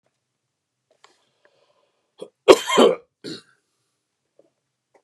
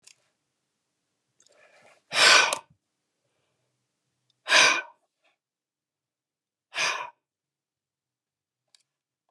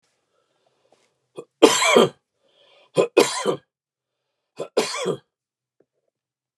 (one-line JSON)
{"cough_length": "5.0 s", "cough_amplitude": 32768, "cough_signal_mean_std_ratio": 0.2, "exhalation_length": "9.3 s", "exhalation_amplitude": 23427, "exhalation_signal_mean_std_ratio": 0.24, "three_cough_length": "6.6 s", "three_cough_amplitude": 32768, "three_cough_signal_mean_std_ratio": 0.3, "survey_phase": "beta (2021-08-13 to 2022-03-07)", "age": "65+", "gender": "Male", "wearing_mask": "No", "symptom_none": true, "smoker_status": "Ex-smoker", "respiratory_condition_asthma": false, "respiratory_condition_other": false, "recruitment_source": "REACT", "submission_delay": "1 day", "covid_test_result": "Negative", "covid_test_method": "RT-qPCR"}